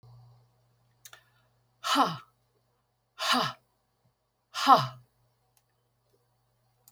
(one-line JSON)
{"exhalation_length": "6.9 s", "exhalation_amplitude": 20845, "exhalation_signal_mean_std_ratio": 0.26, "survey_phase": "beta (2021-08-13 to 2022-03-07)", "age": "65+", "gender": "Female", "wearing_mask": "No", "symptom_none": true, "smoker_status": "Ex-smoker", "respiratory_condition_asthma": false, "respiratory_condition_other": false, "recruitment_source": "REACT", "submission_delay": "1 day", "covid_test_result": "Negative", "covid_test_method": "RT-qPCR"}